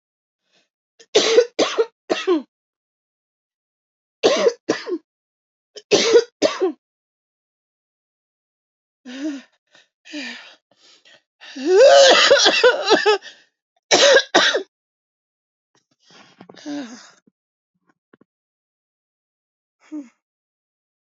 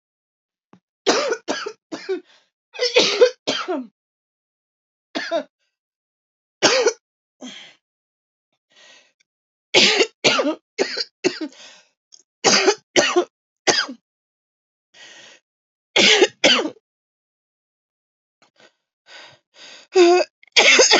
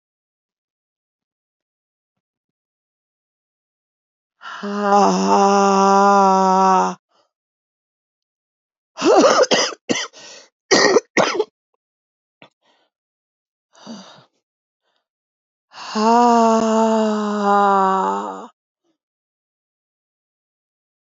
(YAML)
three_cough_length: 21.1 s
three_cough_amplitude: 31020
three_cough_signal_mean_std_ratio: 0.35
cough_length: 21.0 s
cough_amplitude: 32767
cough_signal_mean_std_ratio: 0.37
exhalation_length: 21.1 s
exhalation_amplitude: 29139
exhalation_signal_mean_std_ratio: 0.43
survey_phase: alpha (2021-03-01 to 2021-08-12)
age: 45-64
gender: Female
wearing_mask: 'No'
symptom_cough_any: true
symptom_new_continuous_cough: true
symptom_shortness_of_breath: true
symptom_fatigue: true
symptom_fever_high_temperature: true
symptom_headache: true
symptom_change_to_sense_of_smell_or_taste: true
symptom_loss_of_taste: true
symptom_onset: 6 days
smoker_status: Never smoked
respiratory_condition_asthma: false
respiratory_condition_other: false
recruitment_source: Test and Trace
submission_delay: 2 days
covid_test_result: Positive
covid_test_method: RT-qPCR
covid_ct_value: 12.1
covid_ct_gene: N gene
covid_ct_mean: 12.4
covid_viral_load: 84000000 copies/ml
covid_viral_load_category: High viral load (>1M copies/ml)